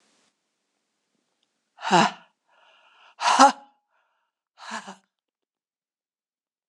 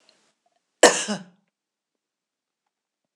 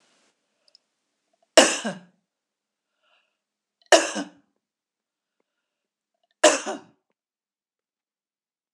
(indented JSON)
{
  "exhalation_length": "6.7 s",
  "exhalation_amplitude": 26025,
  "exhalation_signal_mean_std_ratio": 0.22,
  "cough_length": "3.2 s",
  "cough_amplitude": 26028,
  "cough_signal_mean_std_ratio": 0.19,
  "three_cough_length": "8.7 s",
  "three_cough_amplitude": 26028,
  "three_cough_signal_mean_std_ratio": 0.19,
  "survey_phase": "beta (2021-08-13 to 2022-03-07)",
  "age": "65+",
  "gender": "Female",
  "wearing_mask": "No",
  "symptom_none": true,
  "smoker_status": "Ex-smoker",
  "respiratory_condition_asthma": false,
  "respiratory_condition_other": false,
  "recruitment_source": "REACT",
  "submission_delay": "1 day",
  "covid_test_result": "Negative",
  "covid_test_method": "RT-qPCR"
}